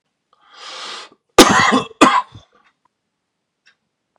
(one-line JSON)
{"cough_length": "4.2 s", "cough_amplitude": 32768, "cough_signal_mean_std_ratio": 0.32, "survey_phase": "beta (2021-08-13 to 2022-03-07)", "age": "18-44", "gender": "Male", "wearing_mask": "No", "symptom_cough_any": true, "symptom_shortness_of_breath": true, "symptom_headache": true, "symptom_onset": "4 days", "smoker_status": "Never smoked", "respiratory_condition_asthma": false, "respiratory_condition_other": false, "recruitment_source": "Test and Trace", "submission_delay": "2 days", "covid_test_result": "Positive", "covid_test_method": "RT-qPCR", "covid_ct_value": 19.4, "covid_ct_gene": "N gene"}